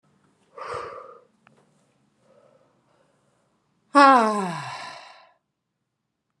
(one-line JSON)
{"exhalation_length": "6.4 s", "exhalation_amplitude": 29242, "exhalation_signal_mean_std_ratio": 0.25, "survey_phase": "beta (2021-08-13 to 2022-03-07)", "age": "18-44", "gender": "Female", "wearing_mask": "No", "symptom_runny_or_blocked_nose": true, "symptom_onset": "4 days", "smoker_status": "Ex-smoker", "respiratory_condition_asthma": false, "respiratory_condition_other": false, "recruitment_source": "REACT", "submission_delay": "0 days", "covid_test_result": "Negative", "covid_test_method": "RT-qPCR"}